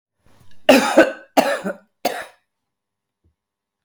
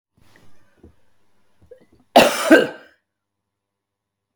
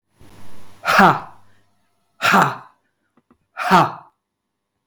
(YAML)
three_cough_length: 3.8 s
three_cough_amplitude: 32768
three_cough_signal_mean_std_ratio: 0.33
cough_length: 4.4 s
cough_amplitude: 32768
cough_signal_mean_std_ratio: 0.25
exhalation_length: 4.9 s
exhalation_amplitude: 32766
exhalation_signal_mean_std_ratio: 0.38
survey_phase: beta (2021-08-13 to 2022-03-07)
age: 45-64
gender: Female
wearing_mask: 'No'
symptom_cough_any: true
symptom_runny_or_blocked_nose: true
symptom_onset: 12 days
smoker_status: Ex-smoker
respiratory_condition_asthma: false
respiratory_condition_other: false
recruitment_source: REACT
submission_delay: 3 days
covid_test_result: Negative
covid_test_method: RT-qPCR
influenza_a_test_result: Negative
influenza_b_test_result: Negative